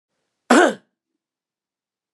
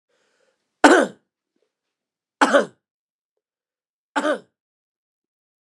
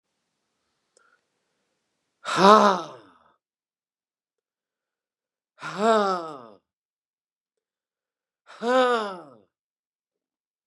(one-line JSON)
{"cough_length": "2.1 s", "cough_amplitude": 32143, "cough_signal_mean_std_ratio": 0.25, "three_cough_length": "5.6 s", "three_cough_amplitude": 32767, "three_cough_signal_mean_std_ratio": 0.23, "exhalation_length": "10.7 s", "exhalation_amplitude": 29027, "exhalation_signal_mean_std_ratio": 0.26, "survey_phase": "beta (2021-08-13 to 2022-03-07)", "age": "65+", "gender": "Male", "wearing_mask": "No", "symptom_runny_or_blocked_nose": true, "symptom_onset": "10 days", "smoker_status": "Never smoked", "respiratory_condition_asthma": false, "respiratory_condition_other": false, "recruitment_source": "REACT", "submission_delay": "1 day", "covid_test_result": "Positive", "covid_test_method": "RT-qPCR", "covid_ct_value": 29.6, "covid_ct_gene": "E gene", "influenza_a_test_result": "Negative", "influenza_b_test_result": "Negative"}